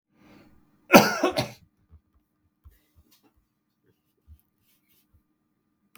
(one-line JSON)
{"cough_length": "6.0 s", "cough_amplitude": 32768, "cough_signal_mean_std_ratio": 0.18, "survey_phase": "beta (2021-08-13 to 2022-03-07)", "age": "65+", "gender": "Male", "wearing_mask": "No", "symptom_cough_any": true, "symptom_runny_or_blocked_nose": true, "symptom_fatigue": true, "symptom_headache": true, "symptom_onset": "4 days", "smoker_status": "Ex-smoker", "respiratory_condition_asthma": false, "respiratory_condition_other": false, "recruitment_source": "Test and Trace", "submission_delay": "1 day", "covid_test_result": "Positive", "covid_test_method": "RT-qPCR"}